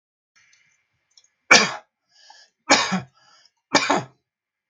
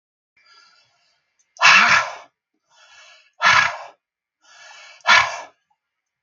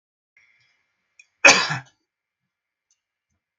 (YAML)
three_cough_length: 4.7 s
three_cough_amplitude: 32767
three_cough_signal_mean_std_ratio: 0.28
exhalation_length: 6.2 s
exhalation_amplitude: 32767
exhalation_signal_mean_std_ratio: 0.33
cough_length: 3.6 s
cough_amplitude: 32767
cough_signal_mean_std_ratio: 0.19
survey_phase: beta (2021-08-13 to 2022-03-07)
age: 65+
gender: Male
wearing_mask: 'No'
symptom_none: true
smoker_status: Never smoked
respiratory_condition_asthma: false
respiratory_condition_other: false
recruitment_source: REACT
submission_delay: 1 day
covid_test_result: Negative
covid_test_method: RT-qPCR
influenza_a_test_result: Negative
influenza_b_test_result: Negative